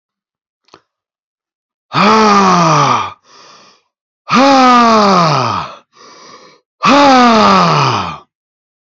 {"exhalation_length": "9.0 s", "exhalation_amplitude": 32767, "exhalation_signal_mean_std_ratio": 0.61, "survey_phase": "beta (2021-08-13 to 2022-03-07)", "age": "18-44", "gender": "Male", "wearing_mask": "No", "symptom_cough_any": true, "symptom_runny_or_blocked_nose": true, "symptom_sore_throat": true, "symptom_headache": true, "symptom_onset": "4 days", "smoker_status": "Never smoked", "respiratory_condition_asthma": false, "respiratory_condition_other": false, "recruitment_source": "Test and Trace", "submission_delay": "2 days", "covid_test_result": "Positive", "covid_test_method": "ePCR"}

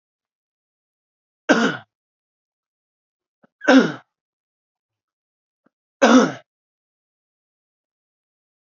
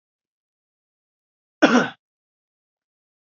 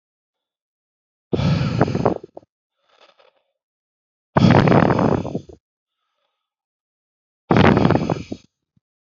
{"three_cough_length": "8.6 s", "three_cough_amplitude": 28071, "three_cough_signal_mean_std_ratio": 0.23, "cough_length": "3.3 s", "cough_amplitude": 27597, "cough_signal_mean_std_ratio": 0.2, "exhalation_length": "9.1 s", "exhalation_amplitude": 30603, "exhalation_signal_mean_std_ratio": 0.39, "survey_phase": "beta (2021-08-13 to 2022-03-07)", "age": "18-44", "gender": "Male", "wearing_mask": "No", "symptom_runny_or_blocked_nose": true, "symptom_fatigue": true, "symptom_fever_high_temperature": true, "symptom_headache": true, "smoker_status": "Never smoked", "respiratory_condition_asthma": false, "respiratory_condition_other": false, "recruitment_source": "Test and Trace", "submission_delay": "2 days", "covid_test_result": "Positive", "covid_test_method": "RT-qPCR", "covid_ct_value": 21.1, "covid_ct_gene": "ORF1ab gene", "covid_ct_mean": 21.9, "covid_viral_load": "65000 copies/ml", "covid_viral_load_category": "Low viral load (10K-1M copies/ml)"}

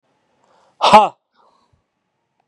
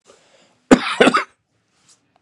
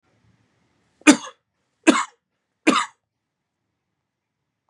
{"exhalation_length": "2.5 s", "exhalation_amplitude": 32768, "exhalation_signal_mean_std_ratio": 0.25, "cough_length": "2.2 s", "cough_amplitude": 32768, "cough_signal_mean_std_ratio": 0.29, "three_cough_length": "4.7 s", "three_cough_amplitude": 32767, "three_cough_signal_mean_std_ratio": 0.21, "survey_phase": "beta (2021-08-13 to 2022-03-07)", "age": "18-44", "gender": "Male", "wearing_mask": "No", "symptom_none": true, "smoker_status": "Never smoked", "recruitment_source": "Test and Trace", "submission_delay": "2 days", "covid_test_result": "Positive", "covid_test_method": "RT-qPCR", "covid_ct_value": 26.6, "covid_ct_gene": "ORF1ab gene", "covid_ct_mean": 26.9, "covid_viral_load": "1500 copies/ml", "covid_viral_load_category": "Minimal viral load (< 10K copies/ml)"}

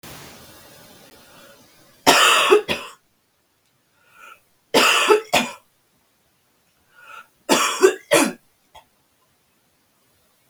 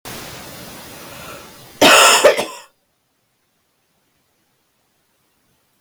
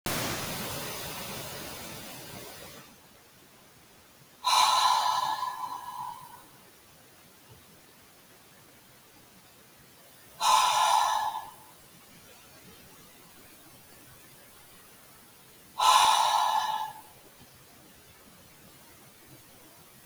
{"three_cough_length": "10.5 s", "three_cough_amplitude": 32766, "three_cough_signal_mean_std_ratio": 0.35, "cough_length": "5.8 s", "cough_amplitude": 32768, "cough_signal_mean_std_ratio": 0.3, "exhalation_length": "20.1 s", "exhalation_amplitude": 13913, "exhalation_signal_mean_std_ratio": 0.44, "survey_phase": "beta (2021-08-13 to 2022-03-07)", "age": "45-64", "gender": "Female", "wearing_mask": "No", "symptom_cough_any": true, "symptom_runny_or_blocked_nose": true, "symptom_sore_throat": true, "symptom_abdominal_pain": true, "symptom_fatigue": true, "symptom_fever_high_temperature": true, "symptom_headache": true, "symptom_change_to_sense_of_smell_or_taste": true, "symptom_loss_of_taste": true, "symptom_other": true, "symptom_onset": "4 days", "smoker_status": "Never smoked", "respiratory_condition_asthma": false, "respiratory_condition_other": false, "recruitment_source": "Test and Trace", "submission_delay": "2 days", "covid_test_result": "Positive", "covid_test_method": "RT-qPCR", "covid_ct_value": 19.5, "covid_ct_gene": "ORF1ab gene"}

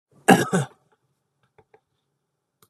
{"cough_length": "2.7 s", "cough_amplitude": 32767, "cough_signal_mean_std_ratio": 0.23, "survey_phase": "beta (2021-08-13 to 2022-03-07)", "age": "45-64", "gender": "Male", "wearing_mask": "No", "symptom_none": true, "smoker_status": "Never smoked", "respiratory_condition_asthma": false, "respiratory_condition_other": false, "recruitment_source": "REACT", "submission_delay": "1 day", "covid_test_result": "Negative", "covid_test_method": "RT-qPCR", "influenza_a_test_result": "Negative", "influenza_b_test_result": "Negative"}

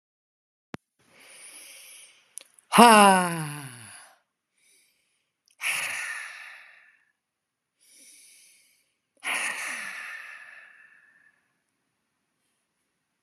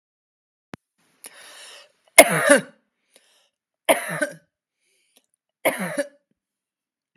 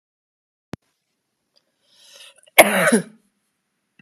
{"exhalation_length": "13.2 s", "exhalation_amplitude": 32169, "exhalation_signal_mean_std_ratio": 0.24, "three_cough_length": "7.2 s", "three_cough_amplitude": 32768, "three_cough_signal_mean_std_ratio": 0.23, "cough_length": "4.0 s", "cough_amplitude": 32768, "cough_signal_mean_std_ratio": 0.23, "survey_phase": "alpha (2021-03-01 to 2021-08-12)", "age": "45-64", "gender": "Female", "wearing_mask": "No", "symptom_none": true, "smoker_status": "Ex-smoker", "respiratory_condition_asthma": true, "respiratory_condition_other": false, "recruitment_source": "REACT", "submission_delay": "1 day", "covid_test_result": "Negative", "covid_test_method": "RT-qPCR"}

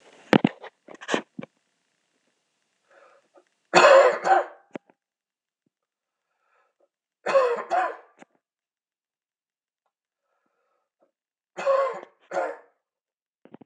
{"three_cough_length": "13.7 s", "three_cough_amplitude": 26028, "three_cough_signal_mean_std_ratio": 0.27, "survey_phase": "beta (2021-08-13 to 2022-03-07)", "age": "45-64", "gender": "Male", "wearing_mask": "No", "symptom_cough_any": true, "symptom_runny_or_blocked_nose": true, "symptom_sore_throat": true, "symptom_headache": true, "symptom_change_to_sense_of_smell_or_taste": true, "symptom_other": true, "symptom_onset": "3 days", "smoker_status": "Never smoked", "respiratory_condition_asthma": false, "respiratory_condition_other": false, "recruitment_source": "Test and Trace", "submission_delay": "2 days", "covid_test_result": "Positive", "covid_test_method": "RT-qPCR", "covid_ct_value": 23.3, "covid_ct_gene": "ORF1ab gene", "covid_ct_mean": 23.7, "covid_viral_load": "17000 copies/ml", "covid_viral_load_category": "Low viral load (10K-1M copies/ml)"}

